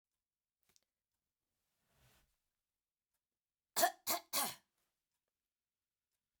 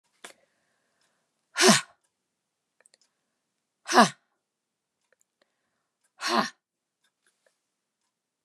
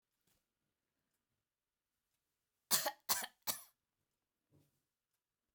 {"cough_length": "6.4 s", "cough_amplitude": 3606, "cough_signal_mean_std_ratio": 0.2, "exhalation_length": "8.4 s", "exhalation_amplitude": 26999, "exhalation_signal_mean_std_ratio": 0.19, "three_cough_length": "5.5 s", "three_cough_amplitude": 6040, "three_cough_signal_mean_std_ratio": 0.21, "survey_phase": "beta (2021-08-13 to 2022-03-07)", "age": "65+", "gender": "Female", "wearing_mask": "No", "symptom_none": true, "smoker_status": "Never smoked", "respiratory_condition_asthma": false, "respiratory_condition_other": false, "recruitment_source": "REACT", "submission_delay": "1 day", "covid_test_result": "Negative", "covid_test_method": "RT-qPCR"}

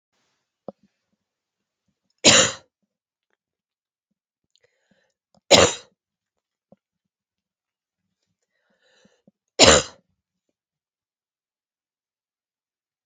{"three_cough_length": "13.1 s", "three_cough_amplitude": 32768, "three_cough_signal_mean_std_ratio": 0.18, "survey_phase": "beta (2021-08-13 to 2022-03-07)", "age": "18-44", "gender": "Female", "wearing_mask": "No", "symptom_cough_any": true, "symptom_runny_or_blocked_nose": true, "symptom_sore_throat": true, "symptom_fatigue": true, "symptom_fever_high_temperature": true, "symptom_onset": "3 days", "smoker_status": "Never smoked", "respiratory_condition_asthma": false, "respiratory_condition_other": false, "recruitment_source": "Test and Trace", "submission_delay": "1 day", "covid_test_result": "Positive", "covid_test_method": "RT-qPCR", "covid_ct_value": 15.0, "covid_ct_gene": "ORF1ab gene"}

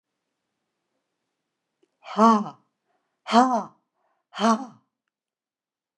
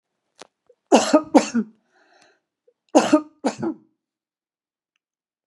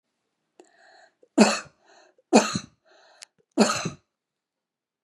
{"exhalation_length": "6.0 s", "exhalation_amplitude": 21700, "exhalation_signal_mean_std_ratio": 0.28, "cough_length": "5.5 s", "cough_amplitude": 32211, "cough_signal_mean_std_ratio": 0.28, "three_cough_length": "5.0 s", "three_cough_amplitude": 25499, "three_cough_signal_mean_std_ratio": 0.27, "survey_phase": "beta (2021-08-13 to 2022-03-07)", "age": "65+", "gender": "Female", "wearing_mask": "No", "symptom_none": true, "smoker_status": "Never smoked", "respiratory_condition_asthma": false, "respiratory_condition_other": false, "recruitment_source": "REACT", "submission_delay": "2 days", "covid_test_result": "Negative", "covid_test_method": "RT-qPCR", "influenza_a_test_result": "Negative", "influenza_b_test_result": "Negative"}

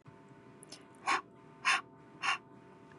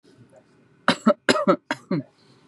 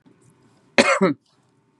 {"exhalation_length": "3.0 s", "exhalation_amplitude": 4837, "exhalation_signal_mean_std_ratio": 0.4, "three_cough_length": "2.5 s", "three_cough_amplitude": 24430, "three_cough_signal_mean_std_ratio": 0.36, "cough_length": "1.8 s", "cough_amplitude": 32624, "cough_signal_mean_std_ratio": 0.34, "survey_phase": "beta (2021-08-13 to 2022-03-07)", "age": "18-44", "gender": "Female", "wearing_mask": "No", "symptom_none": true, "smoker_status": "Never smoked", "respiratory_condition_asthma": false, "respiratory_condition_other": false, "recruitment_source": "REACT", "submission_delay": "1 day", "covid_test_result": "Negative", "covid_test_method": "RT-qPCR", "influenza_a_test_result": "Negative", "influenza_b_test_result": "Negative"}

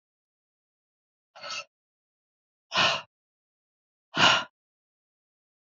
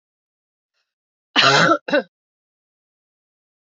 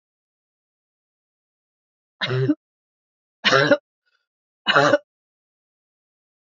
{"exhalation_length": "5.7 s", "exhalation_amplitude": 17378, "exhalation_signal_mean_std_ratio": 0.25, "cough_length": "3.8 s", "cough_amplitude": 26682, "cough_signal_mean_std_ratio": 0.3, "three_cough_length": "6.6 s", "three_cough_amplitude": 26720, "three_cough_signal_mean_std_ratio": 0.28, "survey_phase": "beta (2021-08-13 to 2022-03-07)", "age": "65+", "gender": "Female", "wearing_mask": "No", "symptom_cough_any": true, "symptom_runny_or_blocked_nose": true, "symptom_shortness_of_breath": true, "symptom_sore_throat": true, "symptom_fatigue": true, "symptom_change_to_sense_of_smell_or_taste": true, "symptom_loss_of_taste": true, "smoker_status": "Ex-smoker", "respiratory_condition_asthma": false, "respiratory_condition_other": false, "recruitment_source": "Test and Trace", "submission_delay": "2 days", "covid_test_result": "Positive", "covid_test_method": "LFT"}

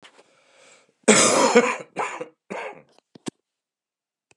{"cough_length": "4.4 s", "cough_amplitude": 30809, "cough_signal_mean_std_ratio": 0.35, "survey_phase": "beta (2021-08-13 to 2022-03-07)", "age": "65+", "gender": "Male", "wearing_mask": "Yes", "symptom_cough_any": true, "symptom_runny_or_blocked_nose": true, "symptom_fatigue": true, "symptom_onset": "4 days", "smoker_status": "Never smoked", "respiratory_condition_asthma": false, "respiratory_condition_other": false, "recruitment_source": "Test and Trace", "submission_delay": "2 days", "covid_test_result": "Positive", "covid_test_method": "ePCR"}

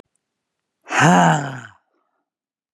{"exhalation_length": "2.7 s", "exhalation_amplitude": 31205, "exhalation_signal_mean_std_ratio": 0.37, "survey_phase": "beta (2021-08-13 to 2022-03-07)", "age": "45-64", "gender": "Female", "wearing_mask": "No", "symptom_none": true, "smoker_status": "Ex-smoker", "respiratory_condition_asthma": false, "respiratory_condition_other": false, "recruitment_source": "REACT", "submission_delay": "3 days", "covid_test_result": "Negative", "covid_test_method": "RT-qPCR", "influenza_a_test_result": "Negative", "influenza_b_test_result": "Negative"}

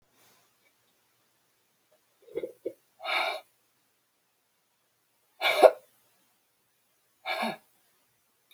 {"exhalation_length": "8.5 s", "exhalation_amplitude": 22968, "exhalation_signal_mean_std_ratio": 0.21, "survey_phase": "beta (2021-08-13 to 2022-03-07)", "age": "65+", "gender": "Female", "wearing_mask": "No", "symptom_none": true, "symptom_onset": "12 days", "smoker_status": "Ex-smoker", "respiratory_condition_asthma": false, "respiratory_condition_other": false, "recruitment_source": "REACT", "submission_delay": "2 days", "covid_test_result": "Negative", "covid_test_method": "RT-qPCR"}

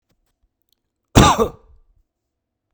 {"cough_length": "2.7 s", "cough_amplitude": 32768, "cough_signal_mean_std_ratio": 0.25, "survey_phase": "beta (2021-08-13 to 2022-03-07)", "age": "45-64", "gender": "Male", "wearing_mask": "No", "symptom_cough_any": true, "smoker_status": "Never smoked", "respiratory_condition_asthma": false, "respiratory_condition_other": false, "recruitment_source": "REACT", "submission_delay": "1 day", "covid_test_result": "Negative", "covid_test_method": "RT-qPCR", "influenza_a_test_result": "Negative", "influenza_b_test_result": "Negative"}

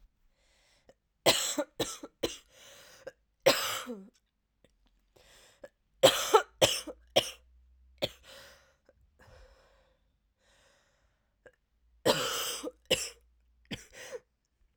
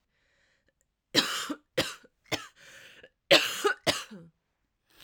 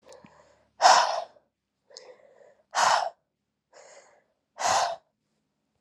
{"three_cough_length": "14.8 s", "three_cough_amplitude": 14711, "three_cough_signal_mean_std_ratio": 0.29, "cough_length": "5.0 s", "cough_amplitude": 17334, "cough_signal_mean_std_ratio": 0.32, "exhalation_length": "5.8 s", "exhalation_amplitude": 21402, "exhalation_signal_mean_std_ratio": 0.33, "survey_phase": "alpha (2021-03-01 to 2021-08-12)", "age": "18-44", "gender": "Female", "wearing_mask": "No", "symptom_cough_any": true, "symptom_shortness_of_breath": true, "symptom_fatigue": true, "symptom_headache": true, "smoker_status": "Never smoked", "respiratory_condition_asthma": true, "respiratory_condition_other": false, "recruitment_source": "Test and Trace", "submission_delay": "1 day", "covid_test_result": "Positive", "covid_test_method": "RT-qPCR", "covid_ct_value": 38.2, "covid_ct_gene": "ORF1ab gene"}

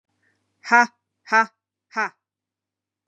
{"exhalation_length": "3.1 s", "exhalation_amplitude": 27780, "exhalation_signal_mean_std_ratio": 0.25, "survey_phase": "beta (2021-08-13 to 2022-03-07)", "age": "45-64", "gender": "Female", "wearing_mask": "No", "symptom_cough_any": true, "symptom_runny_or_blocked_nose": true, "symptom_sore_throat": true, "symptom_headache": true, "symptom_other": true, "symptom_onset": "2 days", "smoker_status": "Never smoked", "respiratory_condition_asthma": false, "respiratory_condition_other": false, "recruitment_source": "Test and Trace", "submission_delay": "1 day", "covid_test_result": "Negative", "covid_test_method": "RT-qPCR"}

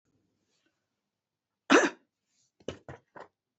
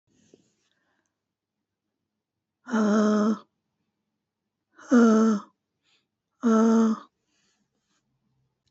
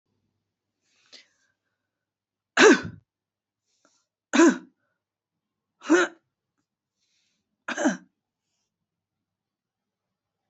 {"cough_length": "3.6 s", "cough_amplitude": 13093, "cough_signal_mean_std_ratio": 0.19, "exhalation_length": "8.7 s", "exhalation_amplitude": 13374, "exhalation_signal_mean_std_ratio": 0.38, "three_cough_length": "10.5 s", "three_cough_amplitude": 26060, "three_cough_signal_mean_std_ratio": 0.22, "survey_phase": "beta (2021-08-13 to 2022-03-07)", "age": "45-64", "gender": "Female", "wearing_mask": "No", "symptom_cough_any": true, "symptom_runny_or_blocked_nose": true, "symptom_sore_throat": true, "smoker_status": "Never smoked", "respiratory_condition_asthma": false, "respiratory_condition_other": false, "recruitment_source": "REACT", "submission_delay": "-1 day", "covid_test_result": "Negative", "covid_test_method": "RT-qPCR", "influenza_a_test_result": "Unknown/Void", "influenza_b_test_result": "Unknown/Void"}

